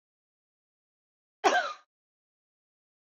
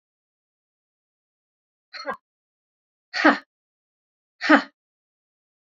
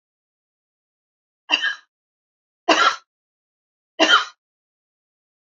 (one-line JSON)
{"cough_length": "3.1 s", "cough_amplitude": 10109, "cough_signal_mean_std_ratio": 0.21, "exhalation_length": "5.6 s", "exhalation_amplitude": 26415, "exhalation_signal_mean_std_ratio": 0.2, "three_cough_length": "5.5 s", "three_cough_amplitude": 27595, "three_cough_signal_mean_std_ratio": 0.27, "survey_phase": "beta (2021-08-13 to 2022-03-07)", "age": "65+", "gender": "Female", "wearing_mask": "No", "symptom_none": true, "smoker_status": "Ex-smoker", "respiratory_condition_asthma": false, "respiratory_condition_other": false, "recruitment_source": "REACT", "submission_delay": "2 days", "covid_test_result": "Negative", "covid_test_method": "RT-qPCR", "influenza_a_test_result": "Negative", "influenza_b_test_result": "Negative"}